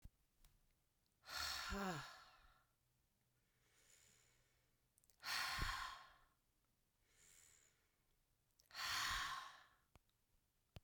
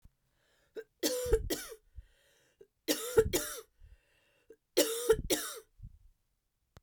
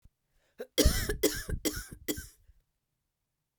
{"exhalation_length": "10.8 s", "exhalation_amplitude": 874, "exhalation_signal_mean_std_ratio": 0.42, "three_cough_length": "6.8 s", "three_cough_amplitude": 8219, "three_cough_signal_mean_std_ratio": 0.38, "cough_length": "3.6 s", "cough_amplitude": 9641, "cough_signal_mean_std_ratio": 0.38, "survey_phase": "beta (2021-08-13 to 2022-03-07)", "age": "45-64", "gender": "Female", "wearing_mask": "No", "symptom_runny_or_blocked_nose": true, "symptom_fatigue": true, "symptom_fever_high_temperature": true, "symptom_headache": true, "smoker_status": "Ex-smoker", "respiratory_condition_asthma": true, "respiratory_condition_other": false, "recruitment_source": "Test and Trace", "submission_delay": "2 days", "covid_test_result": "Positive", "covid_test_method": "LFT"}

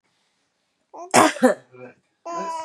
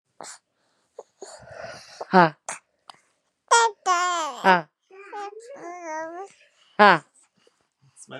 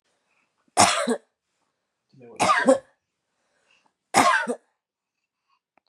{"cough_length": "2.6 s", "cough_amplitude": 31882, "cough_signal_mean_std_ratio": 0.35, "exhalation_length": "8.2 s", "exhalation_amplitude": 31902, "exhalation_signal_mean_std_ratio": 0.31, "three_cough_length": "5.9 s", "three_cough_amplitude": 28132, "three_cough_signal_mean_std_ratio": 0.34, "survey_phase": "beta (2021-08-13 to 2022-03-07)", "age": "18-44", "gender": "Female", "wearing_mask": "No", "symptom_cough_any": true, "symptom_runny_or_blocked_nose": true, "symptom_shortness_of_breath": true, "symptom_headache": true, "symptom_change_to_sense_of_smell_or_taste": true, "symptom_loss_of_taste": true, "symptom_onset": "3 days", "smoker_status": "Never smoked", "respiratory_condition_asthma": false, "respiratory_condition_other": false, "recruitment_source": "Test and Trace", "submission_delay": "2 days", "covid_test_result": "Positive", "covid_test_method": "LAMP"}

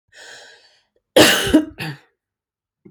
{"cough_length": "2.9 s", "cough_amplitude": 31441, "cough_signal_mean_std_ratio": 0.33, "survey_phase": "beta (2021-08-13 to 2022-03-07)", "age": "45-64", "gender": "Female", "wearing_mask": "No", "symptom_none": true, "smoker_status": "Ex-smoker", "respiratory_condition_asthma": false, "respiratory_condition_other": false, "recruitment_source": "REACT", "submission_delay": "2 days", "covid_test_result": "Negative", "covid_test_method": "RT-qPCR"}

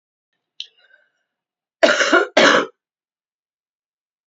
{"cough_length": "4.3 s", "cough_amplitude": 28922, "cough_signal_mean_std_ratio": 0.32, "survey_phase": "beta (2021-08-13 to 2022-03-07)", "age": "45-64", "gender": "Female", "wearing_mask": "No", "symptom_cough_any": true, "symptom_new_continuous_cough": true, "symptom_runny_or_blocked_nose": true, "symptom_shortness_of_breath": true, "symptom_abdominal_pain": true, "symptom_fatigue": true, "symptom_change_to_sense_of_smell_or_taste": true, "symptom_loss_of_taste": true, "symptom_onset": "8 days", "smoker_status": "Never smoked", "respiratory_condition_asthma": true, "respiratory_condition_other": false, "recruitment_source": "Test and Trace", "submission_delay": "2 days", "covid_test_result": "Positive", "covid_test_method": "RT-qPCR", "covid_ct_value": 17.3, "covid_ct_gene": "ORF1ab gene"}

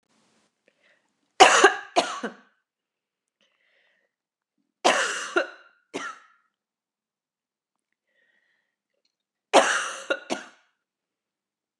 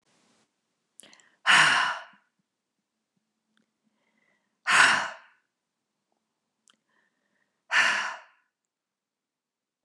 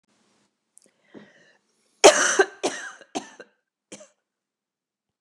{"three_cough_length": "11.8 s", "three_cough_amplitude": 29204, "three_cough_signal_mean_std_ratio": 0.25, "exhalation_length": "9.8 s", "exhalation_amplitude": 17761, "exhalation_signal_mean_std_ratio": 0.28, "cough_length": "5.2 s", "cough_amplitude": 29204, "cough_signal_mean_std_ratio": 0.22, "survey_phase": "beta (2021-08-13 to 2022-03-07)", "age": "18-44", "gender": "Female", "wearing_mask": "No", "symptom_cough_any": true, "symptom_sore_throat": true, "smoker_status": "Never smoked", "respiratory_condition_asthma": false, "respiratory_condition_other": false, "recruitment_source": "Test and Trace", "submission_delay": "1 day", "covid_test_result": "Negative", "covid_test_method": "ePCR"}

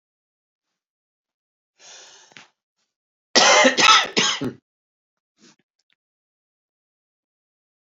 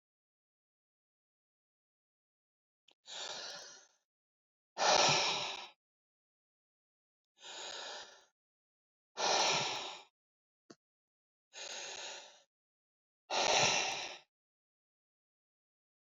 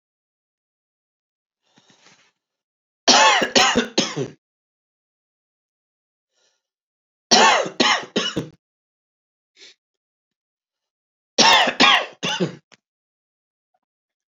{"cough_length": "7.9 s", "cough_amplitude": 29426, "cough_signal_mean_std_ratio": 0.27, "exhalation_length": "16.0 s", "exhalation_amplitude": 5672, "exhalation_signal_mean_std_ratio": 0.34, "three_cough_length": "14.3 s", "three_cough_amplitude": 32768, "three_cough_signal_mean_std_ratio": 0.32, "survey_phase": "alpha (2021-03-01 to 2021-08-12)", "age": "65+", "gender": "Male", "wearing_mask": "No", "symptom_cough_any": true, "symptom_fatigue": true, "symptom_fever_high_temperature": true, "symptom_headache": true, "symptom_change_to_sense_of_smell_or_taste": true, "symptom_onset": "3 days", "smoker_status": "Ex-smoker", "respiratory_condition_asthma": false, "respiratory_condition_other": false, "recruitment_source": "Test and Trace", "submission_delay": "1 day", "covid_test_result": "Positive", "covid_test_method": "RT-qPCR", "covid_ct_value": 16.7, "covid_ct_gene": "ORF1ab gene", "covid_ct_mean": 17.7, "covid_viral_load": "1600000 copies/ml", "covid_viral_load_category": "High viral load (>1M copies/ml)"}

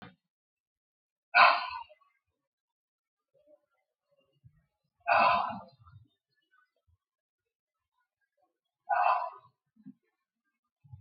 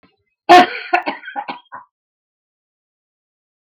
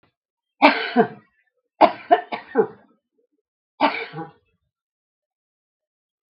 {"exhalation_length": "11.0 s", "exhalation_amplitude": 15885, "exhalation_signal_mean_std_ratio": 0.25, "cough_length": "3.8 s", "cough_amplitude": 32768, "cough_signal_mean_std_ratio": 0.26, "three_cough_length": "6.3 s", "three_cough_amplitude": 32768, "three_cough_signal_mean_std_ratio": 0.28, "survey_phase": "beta (2021-08-13 to 2022-03-07)", "age": "65+", "gender": "Female", "wearing_mask": "No", "symptom_headache": true, "symptom_onset": "12 days", "smoker_status": "Never smoked", "respiratory_condition_asthma": false, "respiratory_condition_other": false, "recruitment_source": "REACT", "submission_delay": "4 days", "covid_test_result": "Negative", "covid_test_method": "RT-qPCR", "influenza_a_test_result": "Negative", "influenza_b_test_result": "Negative"}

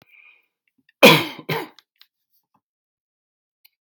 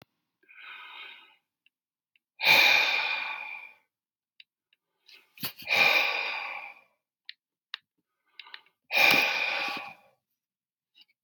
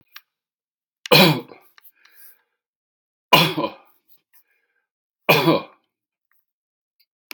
{"cough_length": "3.9 s", "cough_amplitude": 32768, "cough_signal_mean_std_ratio": 0.2, "exhalation_length": "11.2 s", "exhalation_amplitude": 15048, "exhalation_signal_mean_std_ratio": 0.39, "three_cough_length": "7.3 s", "three_cough_amplitude": 32768, "three_cough_signal_mean_std_ratio": 0.27, "survey_phase": "beta (2021-08-13 to 2022-03-07)", "age": "65+", "gender": "Male", "wearing_mask": "No", "symptom_cough_any": true, "smoker_status": "Never smoked", "respiratory_condition_asthma": false, "respiratory_condition_other": false, "recruitment_source": "REACT", "submission_delay": "2 days", "covid_test_result": "Negative", "covid_test_method": "RT-qPCR", "influenza_a_test_result": "Negative", "influenza_b_test_result": "Negative"}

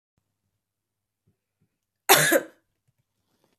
{"cough_length": "3.6 s", "cough_amplitude": 29811, "cough_signal_mean_std_ratio": 0.23, "survey_phase": "beta (2021-08-13 to 2022-03-07)", "age": "18-44", "gender": "Female", "wearing_mask": "No", "symptom_runny_or_blocked_nose": true, "smoker_status": "Never smoked", "respiratory_condition_asthma": false, "respiratory_condition_other": false, "recruitment_source": "Test and Trace", "submission_delay": "1 day", "covid_test_result": "Positive", "covid_test_method": "LFT"}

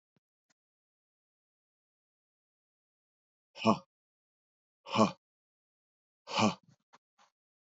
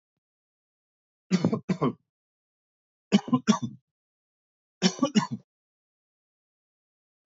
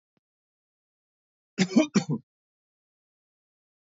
{"exhalation_length": "7.8 s", "exhalation_amplitude": 9046, "exhalation_signal_mean_std_ratio": 0.19, "three_cough_length": "7.3 s", "three_cough_amplitude": 14120, "three_cough_signal_mean_std_ratio": 0.28, "cough_length": "3.8 s", "cough_amplitude": 12033, "cough_signal_mean_std_ratio": 0.23, "survey_phase": "beta (2021-08-13 to 2022-03-07)", "age": "45-64", "gender": "Male", "wearing_mask": "No", "symptom_none": true, "smoker_status": "Never smoked", "respiratory_condition_asthma": false, "respiratory_condition_other": false, "recruitment_source": "Test and Trace", "submission_delay": "1 day", "covid_test_result": "Negative", "covid_test_method": "RT-qPCR"}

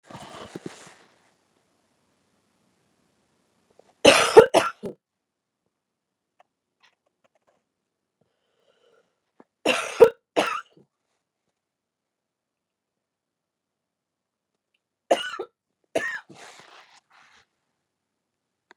{"three_cough_length": "18.8 s", "three_cough_amplitude": 32768, "three_cough_signal_mean_std_ratio": 0.17, "survey_phase": "beta (2021-08-13 to 2022-03-07)", "age": "45-64", "gender": "Female", "wearing_mask": "No", "symptom_none": true, "smoker_status": "Never smoked", "respiratory_condition_asthma": false, "respiratory_condition_other": false, "recruitment_source": "REACT", "submission_delay": "1 day", "covid_test_result": "Negative", "covid_test_method": "RT-qPCR", "influenza_a_test_result": "Negative", "influenza_b_test_result": "Negative"}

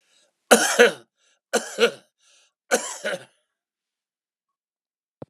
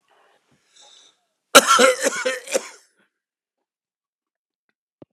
{"three_cough_length": "5.3 s", "three_cough_amplitude": 32276, "three_cough_signal_mean_std_ratio": 0.28, "cough_length": "5.1 s", "cough_amplitude": 32768, "cough_signal_mean_std_ratio": 0.27, "survey_phase": "beta (2021-08-13 to 2022-03-07)", "age": "65+", "gender": "Male", "wearing_mask": "No", "symptom_shortness_of_breath": true, "smoker_status": "Ex-smoker", "respiratory_condition_asthma": false, "respiratory_condition_other": false, "recruitment_source": "REACT", "submission_delay": "2 days", "covid_test_result": "Negative", "covid_test_method": "RT-qPCR", "influenza_a_test_result": "Negative", "influenza_b_test_result": "Negative"}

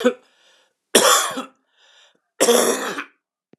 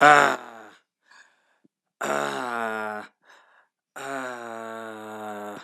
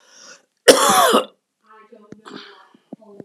{"three_cough_length": "3.6 s", "three_cough_amplitude": 32513, "three_cough_signal_mean_std_ratio": 0.43, "exhalation_length": "5.6 s", "exhalation_amplitude": 32091, "exhalation_signal_mean_std_ratio": 0.36, "cough_length": "3.2 s", "cough_amplitude": 32768, "cough_signal_mean_std_ratio": 0.34, "survey_phase": "alpha (2021-03-01 to 2021-08-12)", "age": "45-64", "gender": "Male", "wearing_mask": "No", "symptom_fatigue": true, "symptom_headache": true, "symptom_change_to_sense_of_smell_or_taste": true, "symptom_loss_of_taste": true, "symptom_onset": "5 days", "smoker_status": "Never smoked", "respiratory_condition_asthma": false, "respiratory_condition_other": false, "recruitment_source": "Test and Trace", "submission_delay": "3 days", "covid_test_result": "Positive", "covid_test_method": "RT-qPCR", "covid_ct_value": 16.0, "covid_ct_gene": "ORF1ab gene", "covid_ct_mean": 16.2, "covid_viral_load": "5000000 copies/ml", "covid_viral_load_category": "High viral load (>1M copies/ml)"}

